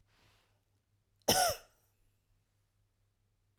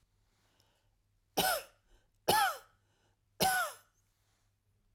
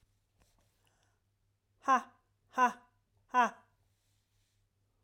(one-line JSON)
{"cough_length": "3.6 s", "cough_amplitude": 6066, "cough_signal_mean_std_ratio": 0.23, "three_cough_length": "4.9 s", "three_cough_amplitude": 6418, "three_cough_signal_mean_std_ratio": 0.34, "exhalation_length": "5.0 s", "exhalation_amplitude": 5604, "exhalation_signal_mean_std_ratio": 0.24, "survey_phase": "alpha (2021-03-01 to 2021-08-12)", "age": "45-64", "gender": "Female", "wearing_mask": "No", "symptom_none": true, "smoker_status": "Never smoked", "respiratory_condition_asthma": false, "respiratory_condition_other": false, "recruitment_source": "REACT", "submission_delay": "1 day", "covid_test_result": "Negative", "covid_test_method": "RT-qPCR"}